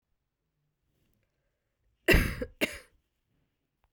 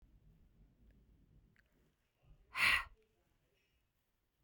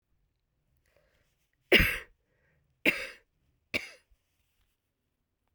{"cough_length": "3.9 s", "cough_amplitude": 11509, "cough_signal_mean_std_ratio": 0.23, "exhalation_length": "4.4 s", "exhalation_amplitude": 3607, "exhalation_signal_mean_std_ratio": 0.22, "three_cough_length": "5.5 s", "three_cough_amplitude": 16603, "three_cough_signal_mean_std_ratio": 0.21, "survey_phase": "beta (2021-08-13 to 2022-03-07)", "age": "45-64", "gender": "Female", "wearing_mask": "No", "symptom_new_continuous_cough": true, "symptom_runny_or_blocked_nose": true, "symptom_diarrhoea": true, "symptom_headache": true, "symptom_change_to_sense_of_smell_or_taste": true, "symptom_loss_of_taste": true, "symptom_onset": "3 days", "smoker_status": "Ex-smoker", "respiratory_condition_asthma": false, "respiratory_condition_other": false, "recruitment_source": "Test and Trace", "submission_delay": "2 days", "covid_test_result": "Positive", "covid_test_method": "ePCR"}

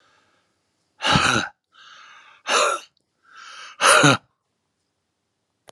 {"exhalation_length": "5.7 s", "exhalation_amplitude": 30812, "exhalation_signal_mean_std_ratio": 0.36, "survey_phase": "beta (2021-08-13 to 2022-03-07)", "age": "65+", "gender": "Male", "wearing_mask": "No", "symptom_none": true, "smoker_status": "Ex-smoker", "respiratory_condition_asthma": false, "respiratory_condition_other": false, "recruitment_source": "Test and Trace", "submission_delay": "2 days", "covid_test_result": "Negative", "covid_test_method": "RT-qPCR"}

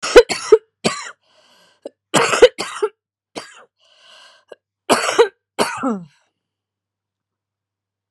{"three_cough_length": "8.1 s", "three_cough_amplitude": 32768, "three_cough_signal_mean_std_ratio": 0.29, "survey_phase": "beta (2021-08-13 to 2022-03-07)", "age": "45-64", "wearing_mask": "No", "symptom_cough_any": true, "symptom_shortness_of_breath": true, "symptom_sore_throat": true, "symptom_fatigue": true, "symptom_headache": true, "symptom_onset": "8 days", "smoker_status": "Never smoked", "respiratory_condition_asthma": true, "respiratory_condition_other": false, "recruitment_source": "Test and Trace", "submission_delay": "2 days", "covid_test_result": "Negative", "covid_test_method": "RT-qPCR"}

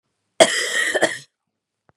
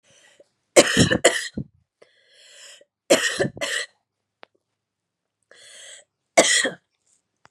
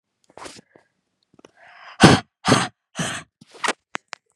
{"cough_length": "2.0 s", "cough_amplitude": 32767, "cough_signal_mean_std_ratio": 0.41, "three_cough_length": "7.5 s", "three_cough_amplitude": 32767, "three_cough_signal_mean_std_ratio": 0.32, "exhalation_length": "4.4 s", "exhalation_amplitude": 32768, "exhalation_signal_mean_std_ratio": 0.27, "survey_phase": "beta (2021-08-13 to 2022-03-07)", "age": "18-44", "gender": "Female", "wearing_mask": "No", "symptom_cough_any": true, "symptom_runny_or_blocked_nose": true, "symptom_fatigue": true, "symptom_headache": true, "symptom_onset": "3 days", "smoker_status": "Never smoked", "respiratory_condition_asthma": false, "respiratory_condition_other": false, "recruitment_source": "Test and Trace", "submission_delay": "2 days", "covid_test_result": "Positive", "covid_test_method": "RT-qPCR", "covid_ct_value": 25.9, "covid_ct_gene": "ORF1ab gene", "covid_ct_mean": 26.1, "covid_viral_load": "2800 copies/ml", "covid_viral_load_category": "Minimal viral load (< 10K copies/ml)"}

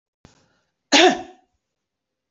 {"cough_length": "2.3 s", "cough_amplitude": 26728, "cough_signal_mean_std_ratio": 0.26, "survey_phase": "beta (2021-08-13 to 2022-03-07)", "age": "45-64", "gender": "Female", "wearing_mask": "No", "symptom_runny_or_blocked_nose": true, "symptom_diarrhoea": true, "symptom_fatigue": true, "smoker_status": "Never smoked", "respiratory_condition_asthma": false, "respiratory_condition_other": false, "recruitment_source": "Test and Trace", "submission_delay": "2 days", "covid_test_result": "Positive", "covid_test_method": "RT-qPCR", "covid_ct_value": 19.2, "covid_ct_gene": "ORF1ab gene"}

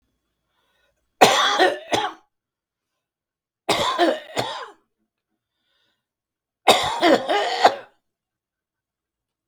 {"three_cough_length": "9.5 s", "three_cough_amplitude": 32768, "three_cough_signal_mean_std_ratio": 0.37, "survey_phase": "beta (2021-08-13 to 2022-03-07)", "age": "65+", "gender": "Male", "wearing_mask": "No", "symptom_cough_any": true, "smoker_status": "Never smoked", "respiratory_condition_asthma": false, "respiratory_condition_other": false, "recruitment_source": "REACT", "submission_delay": "2 days", "covid_test_result": "Negative", "covid_test_method": "RT-qPCR", "influenza_a_test_result": "Negative", "influenza_b_test_result": "Negative"}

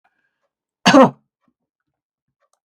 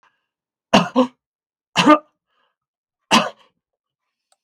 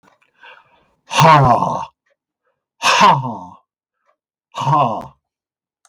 {"cough_length": "2.6 s", "cough_amplitude": 32768, "cough_signal_mean_std_ratio": 0.24, "three_cough_length": "4.4 s", "three_cough_amplitude": 32768, "three_cough_signal_mean_std_ratio": 0.28, "exhalation_length": "5.9 s", "exhalation_amplitude": 32768, "exhalation_signal_mean_std_ratio": 0.42, "survey_phase": "beta (2021-08-13 to 2022-03-07)", "age": "65+", "gender": "Male", "wearing_mask": "No", "symptom_none": true, "smoker_status": "Never smoked", "respiratory_condition_asthma": false, "respiratory_condition_other": false, "recruitment_source": "REACT", "submission_delay": "2 days", "covid_test_result": "Negative", "covid_test_method": "RT-qPCR", "influenza_a_test_result": "Negative", "influenza_b_test_result": "Negative"}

